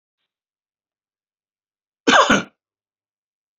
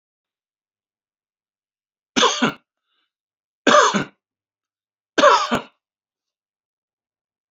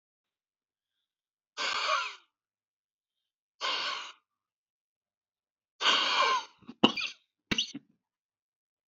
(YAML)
cough_length: 3.6 s
cough_amplitude: 29396
cough_signal_mean_std_ratio: 0.23
three_cough_length: 7.5 s
three_cough_amplitude: 27958
three_cough_signal_mean_std_ratio: 0.28
exhalation_length: 8.9 s
exhalation_amplitude: 16565
exhalation_signal_mean_std_ratio: 0.35
survey_phase: beta (2021-08-13 to 2022-03-07)
age: 65+
gender: Male
wearing_mask: 'No'
symptom_none: true
smoker_status: Never smoked
respiratory_condition_asthma: true
respiratory_condition_other: false
recruitment_source: REACT
submission_delay: 2 days
covid_test_result: Negative
covid_test_method: RT-qPCR